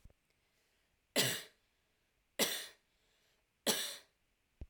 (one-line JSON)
{"three_cough_length": "4.7 s", "three_cough_amplitude": 4640, "three_cough_signal_mean_std_ratio": 0.31, "survey_phase": "alpha (2021-03-01 to 2021-08-12)", "age": "18-44", "gender": "Female", "wearing_mask": "No", "symptom_none": true, "smoker_status": "Never smoked", "respiratory_condition_asthma": true, "respiratory_condition_other": false, "recruitment_source": "REACT", "submission_delay": "1 day", "covid_test_result": "Negative", "covid_test_method": "RT-qPCR"}